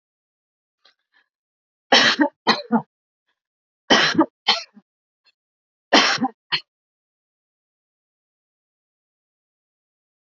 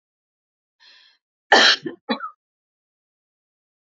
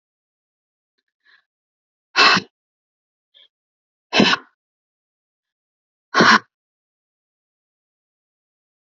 {
  "three_cough_length": "10.2 s",
  "three_cough_amplitude": 29164,
  "three_cough_signal_mean_std_ratio": 0.28,
  "cough_length": "3.9 s",
  "cough_amplitude": 27347,
  "cough_signal_mean_std_ratio": 0.24,
  "exhalation_length": "9.0 s",
  "exhalation_amplitude": 32767,
  "exhalation_signal_mean_std_ratio": 0.22,
  "survey_phase": "alpha (2021-03-01 to 2021-08-12)",
  "age": "45-64",
  "gender": "Female",
  "wearing_mask": "No",
  "symptom_none": true,
  "smoker_status": "Ex-smoker",
  "respiratory_condition_asthma": false,
  "respiratory_condition_other": false,
  "recruitment_source": "REACT",
  "submission_delay": "2 days",
  "covid_test_result": "Negative",
  "covid_test_method": "RT-qPCR"
}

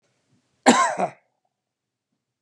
{
  "cough_length": "2.4 s",
  "cough_amplitude": 29657,
  "cough_signal_mean_std_ratio": 0.29,
  "survey_phase": "beta (2021-08-13 to 2022-03-07)",
  "age": "65+",
  "gender": "Male",
  "wearing_mask": "No",
  "symptom_none": true,
  "smoker_status": "Ex-smoker",
  "respiratory_condition_asthma": false,
  "respiratory_condition_other": false,
  "recruitment_source": "REACT",
  "submission_delay": "2 days",
  "covid_test_result": "Negative",
  "covid_test_method": "RT-qPCR",
  "influenza_a_test_result": "Negative",
  "influenza_b_test_result": "Negative"
}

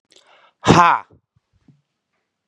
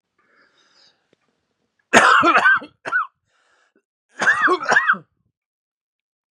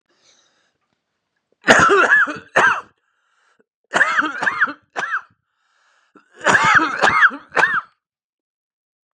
{
  "exhalation_length": "2.5 s",
  "exhalation_amplitude": 32768,
  "exhalation_signal_mean_std_ratio": 0.27,
  "cough_length": "6.3 s",
  "cough_amplitude": 32768,
  "cough_signal_mean_std_ratio": 0.39,
  "three_cough_length": "9.1 s",
  "three_cough_amplitude": 32768,
  "three_cough_signal_mean_std_ratio": 0.45,
  "survey_phase": "beta (2021-08-13 to 2022-03-07)",
  "age": "45-64",
  "gender": "Male",
  "wearing_mask": "Yes",
  "symptom_cough_any": true,
  "symptom_change_to_sense_of_smell_or_taste": true,
  "symptom_loss_of_taste": true,
  "symptom_onset": "3 days",
  "smoker_status": "Never smoked",
  "respiratory_condition_asthma": false,
  "respiratory_condition_other": false,
  "recruitment_source": "Test and Trace",
  "submission_delay": "2 days",
  "covid_test_result": "Positive",
  "covid_test_method": "RT-qPCR",
  "covid_ct_value": 22.0,
  "covid_ct_gene": "ORF1ab gene",
  "covid_ct_mean": 22.4,
  "covid_viral_load": "44000 copies/ml",
  "covid_viral_load_category": "Low viral load (10K-1M copies/ml)"
}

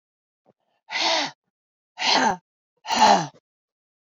{
  "exhalation_length": "4.1 s",
  "exhalation_amplitude": 20888,
  "exhalation_signal_mean_std_ratio": 0.4,
  "survey_phase": "beta (2021-08-13 to 2022-03-07)",
  "age": "45-64",
  "gender": "Female",
  "wearing_mask": "No",
  "symptom_cough_any": true,
  "symptom_runny_or_blocked_nose": true,
  "symptom_sore_throat": true,
  "symptom_diarrhoea": true,
  "symptom_headache": true,
  "symptom_change_to_sense_of_smell_or_taste": true,
  "smoker_status": "Never smoked",
  "respiratory_condition_asthma": false,
  "respiratory_condition_other": false,
  "recruitment_source": "Test and Trace",
  "submission_delay": "1 day",
  "covid_test_result": "Positive",
  "covid_test_method": "ePCR"
}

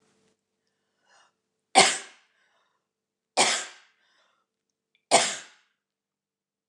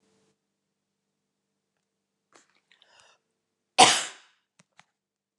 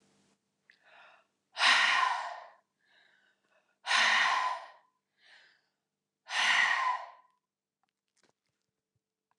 {
  "three_cough_length": "6.7 s",
  "three_cough_amplitude": 25938,
  "three_cough_signal_mean_std_ratio": 0.23,
  "cough_length": "5.4 s",
  "cough_amplitude": 28389,
  "cough_signal_mean_std_ratio": 0.15,
  "exhalation_length": "9.4 s",
  "exhalation_amplitude": 9436,
  "exhalation_signal_mean_std_ratio": 0.4,
  "survey_phase": "beta (2021-08-13 to 2022-03-07)",
  "age": "45-64",
  "gender": "Female",
  "wearing_mask": "No",
  "symptom_none": true,
  "smoker_status": "Never smoked",
  "respiratory_condition_asthma": false,
  "respiratory_condition_other": false,
  "recruitment_source": "REACT",
  "submission_delay": "7 days",
  "covid_test_result": "Negative",
  "covid_test_method": "RT-qPCR",
  "influenza_a_test_result": "Negative",
  "influenza_b_test_result": "Negative"
}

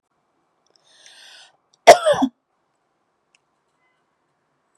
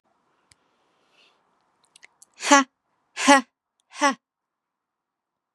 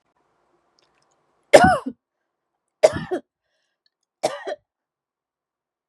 {
  "cough_length": "4.8 s",
  "cough_amplitude": 32768,
  "cough_signal_mean_std_ratio": 0.18,
  "exhalation_length": "5.5 s",
  "exhalation_amplitude": 31534,
  "exhalation_signal_mean_std_ratio": 0.22,
  "three_cough_length": "5.9 s",
  "three_cough_amplitude": 32768,
  "three_cough_signal_mean_std_ratio": 0.21,
  "survey_phase": "beta (2021-08-13 to 2022-03-07)",
  "age": "18-44",
  "gender": "Female",
  "wearing_mask": "No",
  "symptom_runny_or_blocked_nose": true,
  "symptom_sore_throat": true,
  "smoker_status": "Never smoked",
  "respiratory_condition_asthma": false,
  "respiratory_condition_other": false,
  "recruitment_source": "Test and Trace",
  "submission_delay": "2 days",
  "covid_test_result": "Positive",
  "covid_test_method": "LFT"
}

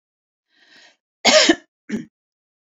{
  "cough_length": "2.6 s",
  "cough_amplitude": 31261,
  "cough_signal_mean_std_ratio": 0.29,
  "survey_phase": "beta (2021-08-13 to 2022-03-07)",
  "age": "18-44",
  "gender": "Female",
  "wearing_mask": "No",
  "symptom_none": true,
  "smoker_status": "Never smoked",
  "respiratory_condition_asthma": false,
  "respiratory_condition_other": false,
  "recruitment_source": "REACT",
  "submission_delay": "1 day",
  "covid_test_result": "Negative",
  "covid_test_method": "RT-qPCR"
}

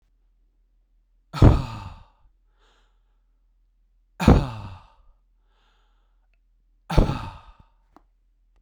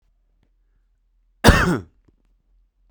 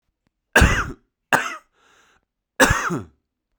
{
  "exhalation_length": "8.6 s",
  "exhalation_amplitude": 32767,
  "exhalation_signal_mean_std_ratio": 0.23,
  "cough_length": "2.9 s",
  "cough_amplitude": 32768,
  "cough_signal_mean_std_ratio": 0.25,
  "three_cough_length": "3.6 s",
  "three_cough_amplitude": 32767,
  "three_cough_signal_mean_std_ratio": 0.36,
  "survey_phase": "beta (2021-08-13 to 2022-03-07)",
  "age": "45-64",
  "gender": "Male",
  "wearing_mask": "No",
  "symptom_new_continuous_cough": true,
  "symptom_sore_throat": true,
  "symptom_fatigue": true,
  "symptom_headache": true,
  "symptom_other": true,
  "symptom_onset": "3 days",
  "smoker_status": "Ex-smoker",
  "respiratory_condition_asthma": false,
  "respiratory_condition_other": false,
  "recruitment_source": "Test and Trace",
  "submission_delay": "1 day",
  "covid_test_result": "Positive",
  "covid_test_method": "RT-qPCR"
}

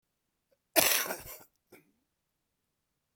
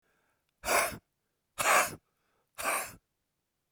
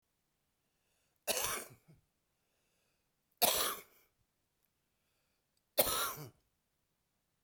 {
  "cough_length": "3.2 s",
  "cough_amplitude": 18244,
  "cough_signal_mean_std_ratio": 0.26,
  "exhalation_length": "3.7 s",
  "exhalation_amplitude": 8435,
  "exhalation_signal_mean_std_ratio": 0.37,
  "three_cough_length": "7.4 s",
  "three_cough_amplitude": 6594,
  "three_cough_signal_mean_std_ratio": 0.29,
  "survey_phase": "beta (2021-08-13 to 2022-03-07)",
  "age": "45-64",
  "gender": "Male",
  "wearing_mask": "No",
  "symptom_cough_any": true,
  "symptom_runny_or_blocked_nose": true,
  "symptom_sore_throat": true,
  "symptom_onset": "4 days",
  "smoker_status": "Ex-smoker",
  "respiratory_condition_asthma": false,
  "respiratory_condition_other": false,
  "recruitment_source": "Test and Trace",
  "submission_delay": "2 days",
  "covid_test_result": "Positive",
  "covid_test_method": "RT-qPCR",
  "covid_ct_value": 22.4,
  "covid_ct_gene": "N gene"
}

